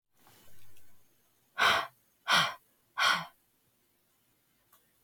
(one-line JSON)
{"exhalation_length": "5.0 s", "exhalation_amplitude": 8142, "exhalation_signal_mean_std_ratio": 0.35, "survey_phase": "beta (2021-08-13 to 2022-03-07)", "age": "45-64", "gender": "Female", "wearing_mask": "No", "symptom_cough_any": true, "symptom_new_continuous_cough": true, "symptom_runny_or_blocked_nose": true, "symptom_sore_throat": true, "symptom_fatigue": true, "symptom_fever_high_temperature": true, "symptom_headache": true, "symptom_change_to_sense_of_smell_or_taste": true, "symptom_onset": "5 days", "smoker_status": "Never smoked", "respiratory_condition_asthma": false, "respiratory_condition_other": false, "recruitment_source": "Test and Trace", "submission_delay": "2 days", "covid_test_result": "Positive", "covid_test_method": "ePCR"}